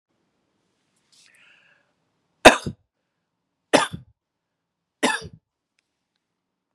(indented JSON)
{
  "three_cough_length": "6.7 s",
  "three_cough_amplitude": 32768,
  "three_cough_signal_mean_std_ratio": 0.16,
  "survey_phase": "beta (2021-08-13 to 2022-03-07)",
  "age": "65+",
  "gender": "Female",
  "wearing_mask": "No",
  "symptom_runny_or_blocked_nose": true,
  "symptom_onset": "12 days",
  "smoker_status": "Ex-smoker",
  "respiratory_condition_asthma": false,
  "respiratory_condition_other": false,
  "recruitment_source": "REACT",
  "submission_delay": "0 days",
  "covid_test_result": "Negative",
  "covid_test_method": "RT-qPCR",
  "influenza_a_test_result": "Negative",
  "influenza_b_test_result": "Negative"
}